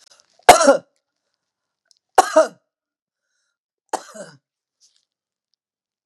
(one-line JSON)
{"three_cough_length": "6.1 s", "three_cough_amplitude": 32768, "three_cough_signal_mean_std_ratio": 0.21, "survey_phase": "beta (2021-08-13 to 2022-03-07)", "age": "65+", "gender": "Female", "wearing_mask": "No", "symptom_none": true, "smoker_status": "Ex-smoker", "respiratory_condition_asthma": false, "respiratory_condition_other": false, "recruitment_source": "REACT", "submission_delay": "1 day", "covid_test_result": "Negative", "covid_test_method": "RT-qPCR", "influenza_a_test_result": "Negative", "influenza_b_test_result": "Negative"}